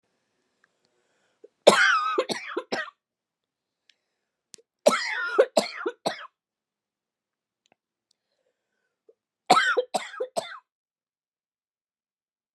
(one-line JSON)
{"three_cough_length": "12.5 s", "three_cough_amplitude": 31755, "three_cough_signal_mean_std_ratio": 0.29, "survey_phase": "beta (2021-08-13 to 2022-03-07)", "age": "45-64", "gender": "Female", "wearing_mask": "No", "symptom_new_continuous_cough": true, "symptom_runny_or_blocked_nose": true, "symptom_fatigue": true, "symptom_headache": true, "symptom_change_to_sense_of_smell_or_taste": true, "symptom_loss_of_taste": true, "symptom_onset": "5 days", "smoker_status": "Never smoked", "respiratory_condition_asthma": true, "respiratory_condition_other": false, "recruitment_source": "Test and Trace", "submission_delay": "4 days", "covid_test_result": "Positive", "covid_test_method": "ePCR"}